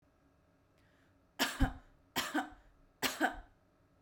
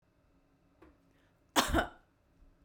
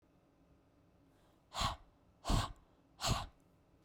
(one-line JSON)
{"three_cough_length": "4.0 s", "three_cough_amplitude": 4370, "three_cough_signal_mean_std_ratio": 0.36, "cough_length": "2.6 s", "cough_amplitude": 8964, "cough_signal_mean_std_ratio": 0.27, "exhalation_length": "3.8 s", "exhalation_amplitude": 3446, "exhalation_signal_mean_std_ratio": 0.35, "survey_phase": "beta (2021-08-13 to 2022-03-07)", "age": "18-44", "gender": "Female", "wearing_mask": "No", "symptom_runny_or_blocked_nose": true, "symptom_sore_throat": true, "symptom_fatigue": true, "symptom_onset": "5 days", "smoker_status": "Never smoked", "respiratory_condition_asthma": false, "respiratory_condition_other": false, "recruitment_source": "REACT", "submission_delay": "1 day", "covid_test_result": "Negative", "covid_test_method": "RT-qPCR"}